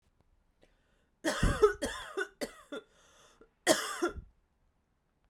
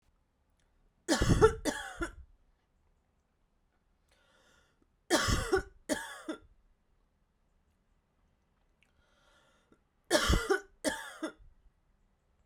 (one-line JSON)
{"cough_length": "5.3 s", "cough_amplitude": 11185, "cough_signal_mean_std_ratio": 0.35, "three_cough_length": "12.5 s", "three_cough_amplitude": 10503, "three_cough_signal_mean_std_ratio": 0.31, "survey_phase": "beta (2021-08-13 to 2022-03-07)", "age": "18-44", "gender": "Female", "wearing_mask": "No", "symptom_cough_any": true, "symptom_runny_or_blocked_nose": true, "symptom_sore_throat": true, "symptom_fatigue": true, "symptom_headache": true, "symptom_change_to_sense_of_smell_or_taste": true, "symptom_onset": "3 days", "smoker_status": "Current smoker (e-cigarettes or vapes only)", "respiratory_condition_asthma": false, "respiratory_condition_other": false, "recruitment_source": "Test and Trace", "submission_delay": "1 day", "covid_test_result": "Positive", "covid_test_method": "ePCR"}